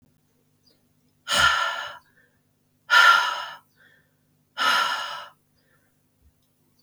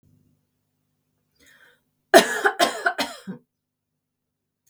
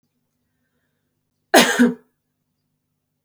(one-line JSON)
{"exhalation_length": "6.8 s", "exhalation_amplitude": 20944, "exhalation_signal_mean_std_ratio": 0.37, "three_cough_length": "4.7 s", "three_cough_amplitude": 32768, "three_cough_signal_mean_std_ratio": 0.25, "cough_length": "3.2 s", "cough_amplitude": 32768, "cough_signal_mean_std_ratio": 0.25, "survey_phase": "beta (2021-08-13 to 2022-03-07)", "age": "18-44", "gender": "Female", "wearing_mask": "No", "symptom_none": true, "smoker_status": "Never smoked", "respiratory_condition_asthma": false, "respiratory_condition_other": false, "recruitment_source": "REACT", "submission_delay": "2 days", "covid_test_result": "Negative", "covid_test_method": "RT-qPCR", "influenza_a_test_result": "Negative", "influenza_b_test_result": "Negative"}